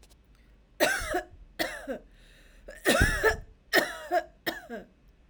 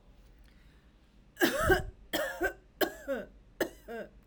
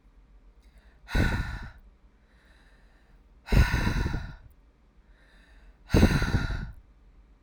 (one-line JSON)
{"cough_length": "5.3 s", "cough_amplitude": 15001, "cough_signal_mean_std_ratio": 0.46, "three_cough_length": "4.3 s", "three_cough_amplitude": 8565, "three_cough_signal_mean_std_ratio": 0.45, "exhalation_length": "7.4 s", "exhalation_amplitude": 15279, "exhalation_signal_mean_std_ratio": 0.41, "survey_phase": "alpha (2021-03-01 to 2021-08-12)", "age": "18-44", "gender": "Female", "wearing_mask": "No", "symptom_headache": true, "smoker_status": "Never smoked", "respiratory_condition_asthma": false, "respiratory_condition_other": false, "recruitment_source": "REACT", "submission_delay": "1 day", "covid_test_result": "Negative", "covid_test_method": "RT-qPCR"}